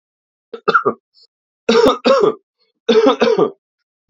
{"three_cough_length": "4.1 s", "three_cough_amplitude": 29637, "three_cough_signal_mean_std_ratio": 0.48, "survey_phase": "alpha (2021-03-01 to 2021-08-12)", "age": "18-44", "gender": "Male", "wearing_mask": "No", "symptom_cough_any": true, "symptom_fatigue": true, "symptom_onset": "2 days", "smoker_status": "Current smoker (1 to 10 cigarettes per day)", "respiratory_condition_asthma": false, "respiratory_condition_other": false, "recruitment_source": "Test and Trace", "submission_delay": "1 day", "covid_test_result": "Positive", "covid_test_method": "RT-qPCR"}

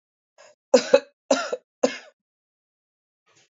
{"cough_length": "3.6 s", "cough_amplitude": 26500, "cough_signal_mean_std_ratio": 0.23, "survey_phase": "beta (2021-08-13 to 2022-03-07)", "age": "45-64", "gender": "Female", "wearing_mask": "No", "symptom_cough_any": true, "symptom_new_continuous_cough": true, "symptom_runny_or_blocked_nose": true, "symptom_shortness_of_breath": true, "symptom_sore_throat": true, "symptom_fatigue": true, "symptom_fever_high_temperature": true, "symptom_headache": true, "symptom_change_to_sense_of_smell_or_taste": true, "symptom_loss_of_taste": true, "symptom_onset": "2 days", "smoker_status": "Current smoker (e-cigarettes or vapes only)", "respiratory_condition_asthma": false, "respiratory_condition_other": true, "recruitment_source": "Test and Trace", "submission_delay": "1 day", "covid_test_result": "Positive", "covid_test_method": "RT-qPCR", "covid_ct_value": 22.0, "covid_ct_gene": "ORF1ab gene"}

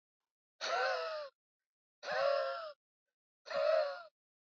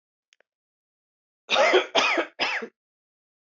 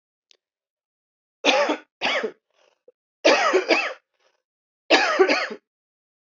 {"exhalation_length": "4.5 s", "exhalation_amplitude": 2782, "exhalation_signal_mean_std_ratio": 0.53, "cough_length": "3.6 s", "cough_amplitude": 17061, "cough_signal_mean_std_ratio": 0.39, "three_cough_length": "6.4 s", "three_cough_amplitude": 24673, "three_cough_signal_mean_std_ratio": 0.41, "survey_phase": "alpha (2021-03-01 to 2021-08-12)", "age": "18-44", "gender": "Female", "wearing_mask": "No", "symptom_cough_any": true, "symptom_fatigue": true, "symptom_headache": true, "smoker_status": "Current smoker (1 to 10 cigarettes per day)", "respiratory_condition_asthma": false, "respiratory_condition_other": false, "recruitment_source": "Test and Trace", "submission_delay": "1 day", "covid_test_result": "Positive", "covid_test_method": "RT-qPCR", "covid_ct_value": 33.1, "covid_ct_gene": "N gene"}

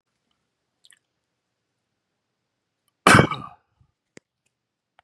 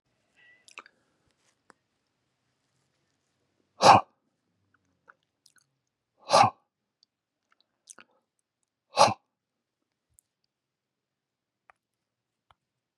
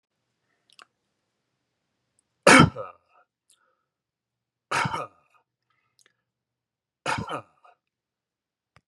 {"cough_length": "5.0 s", "cough_amplitude": 32767, "cough_signal_mean_std_ratio": 0.17, "exhalation_length": "13.0 s", "exhalation_amplitude": 23970, "exhalation_signal_mean_std_ratio": 0.15, "three_cough_length": "8.9 s", "three_cough_amplitude": 30017, "three_cough_signal_mean_std_ratio": 0.18, "survey_phase": "beta (2021-08-13 to 2022-03-07)", "age": "45-64", "gender": "Male", "wearing_mask": "No", "symptom_none": true, "smoker_status": "Never smoked", "respiratory_condition_asthma": false, "respiratory_condition_other": false, "recruitment_source": "REACT", "submission_delay": "2 days", "covid_test_result": "Negative", "covid_test_method": "RT-qPCR", "influenza_a_test_result": "Unknown/Void", "influenza_b_test_result": "Unknown/Void"}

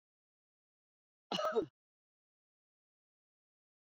{"cough_length": "3.9 s", "cough_amplitude": 2461, "cough_signal_mean_std_ratio": 0.22, "survey_phase": "beta (2021-08-13 to 2022-03-07)", "age": "45-64", "gender": "Female", "wearing_mask": "No", "symptom_none": true, "smoker_status": "Current smoker (11 or more cigarettes per day)", "respiratory_condition_asthma": false, "respiratory_condition_other": false, "recruitment_source": "REACT", "submission_delay": "1 day", "covid_test_result": "Negative", "covid_test_method": "RT-qPCR"}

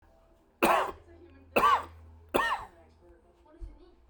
{"three_cough_length": "4.1 s", "three_cough_amplitude": 11028, "three_cough_signal_mean_std_ratio": 0.4, "survey_phase": "beta (2021-08-13 to 2022-03-07)", "age": "18-44", "gender": "Male", "wearing_mask": "No", "symptom_diarrhoea": true, "symptom_fatigue": true, "symptom_onset": "12 days", "smoker_status": "Never smoked", "respiratory_condition_asthma": false, "respiratory_condition_other": false, "recruitment_source": "REACT", "submission_delay": "2 days", "covid_test_result": "Negative", "covid_test_method": "RT-qPCR"}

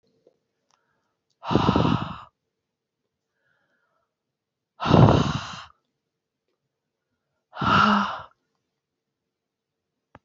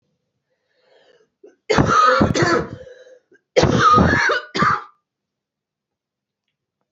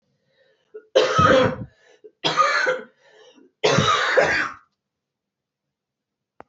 {"exhalation_length": "10.2 s", "exhalation_amplitude": 26293, "exhalation_signal_mean_std_ratio": 0.31, "cough_length": "6.9 s", "cough_amplitude": 27353, "cough_signal_mean_std_ratio": 0.47, "three_cough_length": "6.5 s", "three_cough_amplitude": 22453, "three_cough_signal_mean_std_ratio": 0.47, "survey_phase": "alpha (2021-03-01 to 2021-08-12)", "age": "18-44", "gender": "Female", "wearing_mask": "No", "symptom_cough_any": true, "symptom_diarrhoea": true, "symptom_fatigue": true, "symptom_fever_high_temperature": true, "symptom_change_to_sense_of_smell_or_taste": true, "symptom_onset": "8 days", "smoker_status": "Ex-smoker", "respiratory_condition_asthma": false, "respiratory_condition_other": false, "recruitment_source": "Test and Trace", "submission_delay": "2 days", "covid_test_result": "Positive", "covid_test_method": "RT-qPCR", "covid_ct_value": 20.1, "covid_ct_gene": "ORF1ab gene"}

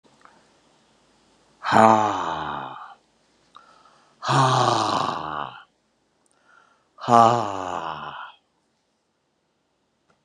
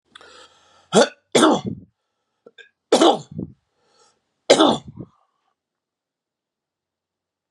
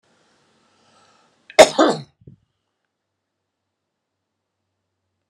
{"exhalation_length": "10.2 s", "exhalation_amplitude": 31011, "exhalation_signal_mean_std_ratio": 0.37, "three_cough_length": "7.5 s", "three_cough_amplitude": 32767, "three_cough_signal_mean_std_ratio": 0.29, "cough_length": "5.3 s", "cough_amplitude": 32768, "cough_signal_mean_std_ratio": 0.16, "survey_phase": "beta (2021-08-13 to 2022-03-07)", "age": "65+", "gender": "Male", "wearing_mask": "No", "symptom_fatigue": true, "symptom_headache": true, "symptom_onset": "5 days", "smoker_status": "Never smoked", "respiratory_condition_asthma": false, "respiratory_condition_other": false, "recruitment_source": "Test and Trace", "submission_delay": "1 day", "covid_test_result": "Positive", "covid_test_method": "RT-qPCR", "covid_ct_value": 18.0, "covid_ct_gene": "ORF1ab gene"}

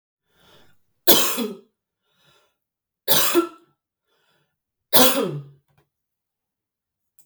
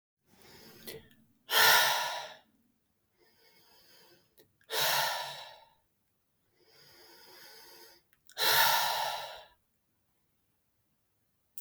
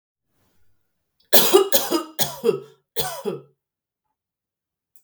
{"three_cough_length": "7.3 s", "three_cough_amplitude": 32768, "three_cough_signal_mean_std_ratio": 0.31, "exhalation_length": "11.6 s", "exhalation_amplitude": 10419, "exhalation_signal_mean_std_ratio": 0.35, "cough_length": "5.0 s", "cough_amplitude": 32768, "cough_signal_mean_std_ratio": 0.34, "survey_phase": "beta (2021-08-13 to 2022-03-07)", "age": "45-64", "gender": "Female", "wearing_mask": "No", "symptom_fatigue": true, "symptom_onset": "12 days", "smoker_status": "Never smoked", "respiratory_condition_asthma": false, "respiratory_condition_other": false, "recruitment_source": "REACT", "submission_delay": "18 days", "covid_test_result": "Negative", "covid_test_method": "RT-qPCR"}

